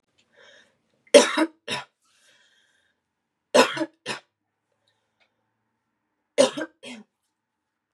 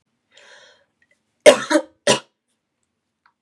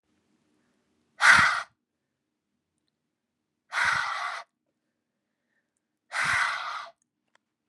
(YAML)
three_cough_length: 7.9 s
three_cough_amplitude: 31954
three_cough_signal_mean_std_ratio: 0.22
cough_length: 3.4 s
cough_amplitude: 32768
cough_signal_mean_std_ratio: 0.23
exhalation_length: 7.7 s
exhalation_amplitude: 23471
exhalation_signal_mean_std_ratio: 0.32
survey_phase: beta (2021-08-13 to 2022-03-07)
age: 18-44
gender: Female
wearing_mask: 'No'
symptom_abdominal_pain: true
symptom_fatigue: true
symptom_headache: true
symptom_onset: 5 days
smoker_status: Never smoked
respiratory_condition_asthma: true
respiratory_condition_other: false
recruitment_source: Test and Trace
submission_delay: 1 day
covid_test_result: Positive
covid_test_method: RT-qPCR
covid_ct_value: 27.9
covid_ct_gene: ORF1ab gene
covid_ct_mean: 28.2
covid_viral_load: 580 copies/ml
covid_viral_load_category: Minimal viral load (< 10K copies/ml)